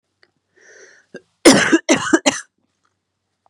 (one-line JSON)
{"cough_length": "3.5 s", "cough_amplitude": 32768, "cough_signal_mean_std_ratio": 0.32, "survey_phase": "beta (2021-08-13 to 2022-03-07)", "age": "45-64", "gender": "Female", "wearing_mask": "No", "symptom_cough_any": true, "symptom_new_continuous_cough": true, "symptom_fatigue": true, "symptom_fever_high_temperature": true, "symptom_headache": true, "symptom_change_to_sense_of_smell_or_taste": true, "symptom_onset": "3 days", "smoker_status": "Never smoked", "respiratory_condition_asthma": false, "respiratory_condition_other": false, "recruitment_source": "Test and Trace", "submission_delay": "1 day", "covid_test_result": "Positive", "covid_test_method": "ePCR"}